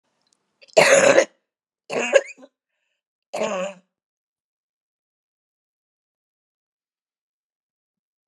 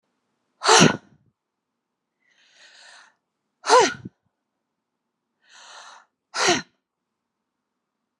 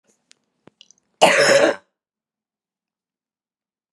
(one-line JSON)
{"three_cough_length": "8.3 s", "three_cough_amplitude": 32192, "three_cough_signal_mean_std_ratio": 0.25, "exhalation_length": "8.2 s", "exhalation_amplitude": 29866, "exhalation_signal_mean_std_ratio": 0.24, "cough_length": "3.9 s", "cough_amplitude": 32743, "cough_signal_mean_std_ratio": 0.29, "survey_phase": "beta (2021-08-13 to 2022-03-07)", "age": "45-64", "gender": "Female", "wearing_mask": "No", "symptom_cough_any": true, "symptom_runny_or_blocked_nose": true, "symptom_onset": "12 days", "smoker_status": "Never smoked", "respiratory_condition_asthma": true, "respiratory_condition_other": false, "recruitment_source": "REACT", "submission_delay": "2 days", "covid_test_result": "Negative", "covid_test_method": "RT-qPCR", "influenza_a_test_result": "Unknown/Void", "influenza_b_test_result": "Unknown/Void"}